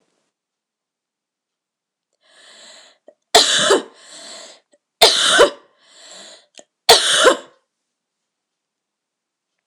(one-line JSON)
{"three_cough_length": "9.7 s", "three_cough_amplitude": 26028, "three_cough_signal_mean_std_ratio": 0.3, "survey_phase": "beta (2021-08-13 to 2022-03-07)", "age": "18-44", "gender": "Female", "wearing_mask": "No", "symptom_cough_any": true, "symptom_new_continuous_cough": true, "symptom_runny_or_blocked_nose": true, "symptom_shortness_of_breath": true, "symptom_sore_throat": true, "symptom_abdominal_pain": true, "symptom_fatigue": true, "symptom_fever_high_temperature": true, "symptom_headache": true, "symptom_onset": "5 days", "smoker_status": "Ex-smoker", "respiratory_condition_asthma": true, "respiratory_condition_other": false, "recruitment_source": "REACT", "submission_delay": "0 days", "covid_test_result": "Positive", "covid_test_method": "RT-qPCR", "covid_ct_value": 22.0, "covid_ct_gene": "E gene", "influenza_a_test_result": "Negative", "influenza_b_test_result": "Negative"}